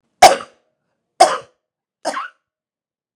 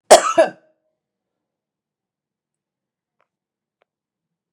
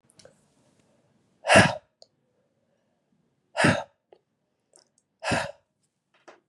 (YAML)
three_cough_length: 3.2 s
three_cough_amplitude: 32768
three_cough_signal_mean_std_ratio: 0.25
cough_length: 4.5 s
cough_amplitude: 32768
cough_signal_mean_std_ratio: 0.18
exhalation_length: 6.5 s
exhalation_amplitude: 27265
exhalation_signal_mean_std_ratio: 0.24
survey_phase: beta (2021-08-13 to 2022-03-07)
age: 45-64
gender: Female
wearing_mask: 'No'
symptom_none: true
symptom_onset: 12 days
smoker_status: Current smoker (11 or more cigarettes per day)
respiratory_condition_asthma: false
respiratory_condition_other: false
recruitment_source: REACT
submission_delay: 0 days
covid_test_result: Negative
covid_test_method: RT-qPCR
influenza_a_test_result: Negative
influenza_b_test_result: Negative